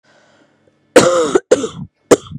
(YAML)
cough_length: 2.4 s
cough_amplitude: 32768
cough_signal_mean_std_ratio: 0.4
survey_phase: beta (2021-08-13 to 2022-03-07)
age: 18-44
gender: Female
wearing_mask: 'No'
symptom_cough_any: true
symptom_new_continuous_cough: true
symptom_runny_or_blocked_nose: true
symptom_sore_throat: true
symptom_fatigue: true
symptom_headache: true
symptom_onset: 4 days
smoker_status: Never smoked
respiratory_condition_asthma: false
respiratory_condition_other: false
recruitment_source: Test and Trace
submission_delay: 1 day
covid_test_result: Positive
covid_test_method: RT-qPCR
covid_ct_value: 19.6
covid_ct_gene: N gene